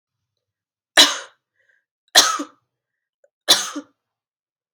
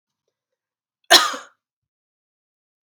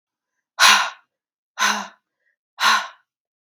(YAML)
three_cough_length: 4.7 s
three_cough_amplitude: 32768
three_cough_signal_mean_std_ratio: 0.25
cough_length: 3.0 s
cough_amplitude: 32768
cough_signal_mean_std_ratio: 0.19
exhalation_length: 3.4 s
exhalation_amplitude: 32768
exhalation_signal_mean_std_ratio: 0.36
survey_phase: beta (2021-08-13 to 2022-03-07)
age: 18-44
gender: Female
wearing_mask: 'No'
symptom_runny_or_blocked_nose: true
symptom_fatigue: true
symptom_headache: true
symptom_change_to_sense_of_smell_or_taste: true
symptom_loss_of_taste: true
smoker_status: Never smoked
respiratory_condition_asthma: false
respiratory_condition_other: false
recruitment_source: Test and Trace
submission_delay: 2 days
covid_test_result: Positive
covid_test_method: RT-qPCR
covid_ct_value: 18.9
covid_ct_gene: ORF1ab gene
covid_ct_mean: 19.2
covid_viral_load: 510000 copies/ml
covid_viral_load_category: Low viral load (10K-1M copies/ml)